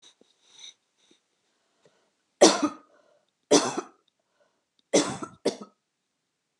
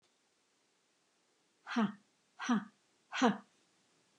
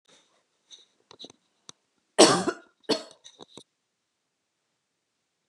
{
  "three_cough_length": "6.6 s",
  "three_cough_amplitude": 24281,
  "three_cough_signal_mean_std_ratio": 0.24,
  "exhalation_length": "4.2 s",
  "exhalation_amplitude": 6202,
  "exhalation_signal_mean_std_ratio": 0.3,
  "cough_length": "5.5 s",
  "cough_amplitude": 28061,
  "cough_signal_mean_std_ratio": 0.19,
  "survey_phase": "beta (2021-08-13 to 2022-03-07)",
  "age": "45-64",
  "gender": "Female",
  "wearing_mask": "No",
  "symptom_none": true,
  "smoker_status": "Never smoked",
  "respiratory_condition_asthma": false,
  "respiratory_condition_other": false,
  "recruitment_source": "REACT",
  "submission_delay": "0 days",
  "covid_test_result": "Negative",
  "covid_test_method": "RT-qPCR"
}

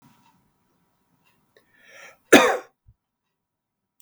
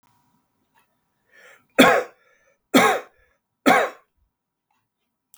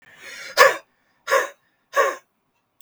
{
  "cough_length": "4.0 s",
  "cough_amplitude": 32768,
  "cough_signal_mean_std_ratio": 0.18,
  "three_cough_length": "5.4 s",
  "three_cough_amplitude": 32768,
  "three_cough_signal_mean_std_ratio": 0.28,
  "exhalation_length": "2.8 s",
  "exhalation_amplitude": 32768,
  "exhalation_signal_mean_std_ratio": 0.34,
  "survey_phase": "beta (2021-08-13 to 2022-03-07)",
  "age": "45-64",
  "gender": "Male",
  "wearing_mask": "No",
  "symptom_none": true,
  "symptom_onset": "4 days",
  "smoker_status": "Ex-smoker",
  "respiratory_condition_asthma": false,
  "respiratory_condition_other": false,
  "recruitment_source": "REACT",
  "submission_delay": "2 days",
  "covid_test_result": "Negative",
  "covid_test_method": "RT-qPCR",
  "influenza_a_test_result": "Negative",
  "influenza_b_test_result": "Negative"
}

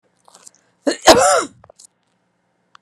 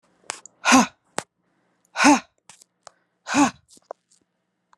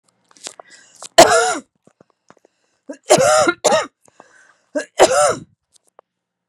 {
  "cough_length": "2.8 s",
  "cough_amplitude": 32768,
  "cough_signal_mean_std_ratio": 0.31,
  "exhalation_length": "4.8 s",
  "exhalation_amplitude": 29253,
  "exhalation_signal_mean_std_ratio": 0.28,
  "three_cough_length": "6.5 s",
  "three_cough_amplitude": 32768,
  "three_cough_signal_mean_std_ratio": 0.37,
  "survey_phase": "beta (2021-08-13 to 2022-03-07)",
  "age": "45-64",
  "gender": "Female",
  "wearing_mask": "No",
  "symptom_none": true,
  "smoker_status": "Never smoked",
  "respiratory_condition_asthma": false,
  "respiratory_condition_other": false,
  "recruitment_source": "REACT",
  "submission_delay": "0 days",
  "covid_test_result": "Negative",
  "covid_test_method": "RT-qPCR"
}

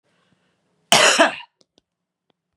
{
  "cough_length": "2.6 s",
  "cough_amplitude": 32768,
  "cough_signal_mean_std_ratio": 0.31,
  "survey_phase": "beta (2021-08-13 to 2022-03-07)",
  "age": "45-64",
  "gender": "Female",
  "wearing_mask": "No",
  "symptom_sore_throat": true,
  "symptom_onset": "5 days",
  "smoker_status": "Never smoked",
  "respiratory_condition_asthma": false,
  "respiratory_condition_other": false,
  "recruitment_source": "Test and Trace",
  "submission_delay": "2 days",
  "covid_test_result": "Positive",
  "covid_test_method": "LAMP"
}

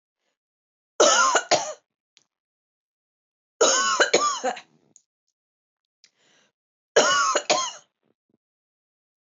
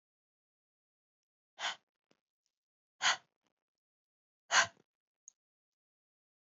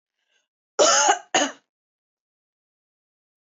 {
  "three_cough_length": "9.4 s",
  "three_cough_amplitude": 18994,
  "three_cough_signal_mean_std_ratio": 0.37,
  "exhalation_length": "6.5 s",
  "exhalation_amplitude": 5746,
  "exhalation_signal_mean_std_ratio": 0.18,
  "cough_length": "3.4 s",
  "cough_amplitude": 16751,
  "cough_signal_mean_std_ratio": 0.32,
  "survey_phase": "beta (2021-08-13 to 2022-03-07)",
  "age": "18-44",
  "gender": "Female",
  "wearing_mask": "No",
  "symptom_none": true,
  "symptom_onset": "13 days",
  "smoker_status": "Never smoked",
  "respiratory_condition_asthma": false,
  "respiratory_condition_other": false,
  "recruitment_source": "REACT",
  "submission_delay": "2 days",
  "covid_test_result": "Negative",
  "covid_test_method": "RT-qPCR",
  "influenza_a_test_result": "Unknown/Void",
  "influenza_b_test_result": "Unknown/Void"
}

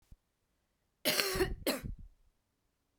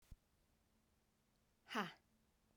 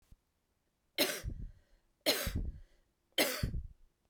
{
  "cough_length": "3.0 s",
  "cough_amplitude": 12796,
  "cough_signal_mean_std_ratio": 0.4,
  "exhalation_length": "2.6 s",
  "exhalation_amplitude": 1122,
  "exhalation_signal_mean_std_ratio": 0.25,
  "three_cough_length": "4.1 s",
  "three_cough_amplitude": 6284,
  "three_cough_signal_mean_std_ratio": 0.44,
  "survey_phase": "beta (2021-08-13 to 2022-03-07)",
  "age": "18-44",
  "gender": "Female",
  "wearing_mask": "No",
  "symptom_cough_any": true,
  "symptom_runny_or_blocked_nose": true,
  "symptom_shortness_of_breath": true,
  "symptom_sore_throat": true,
  "symptom_fatigue": true,
  "symptom_headache": true,
  "smoker_status": "Never smoked",
  "respiratory_condition_asthma": true,
  "respiratory_condition_other": false,
  "recruitment_source": "Test and Trace",
  "submission_delay": "2 days",
  "covid_test_result": "Positive",
  "covid_test_method": "RT-qPCR",
  "covid_ct_value": 28.9,
  "covid_ct_gene": "ORF1ab gene",
  "covid_ct_mean": 29.5,
  "covid_viral_load": "210 copies/ml",
  "covid_viral_load_category": "Minimal viral load (< 10K copies/ml)"
}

